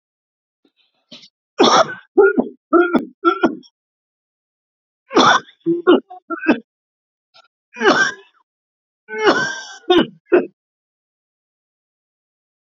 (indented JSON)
{
  "three_cough_length": "12.8 s",
  "three_cough_amplitude": 32767,
  "three_cough_signal_mean_std_ratio": 0.37,
  "survey_phase": "beta (2021-08-13 to 2022-03-07)",
  "age": "65+",
  "gender": "Male",
  "wearing_mask": "No",
  "symptom_cough_any": true,
  "symptom_sore_throat": true,
  "symptom_fatigue": true,
  "symptom_onset": "7 days",
  "smoker_status": "Never smoked",
  "respiratory_condition_asthma": true,
  "respiratory_condition_other": false,
  "recruitment_source": "Test and Trace",
  "submission_delay": "2 days",
  "covid_test_result": "Positive",
  "covid_test_method": "RT-qPCR",
  "covid_ct_value": 21.0,
  "covid_ct_gene": "ORF1ab gene",
  "covid_ct_mean": 21.3,
  "covid_viral_load": "100000 copies/ml",
  "covid_viral_load_category": "Low viral load (10K-1M copies/ml)"
}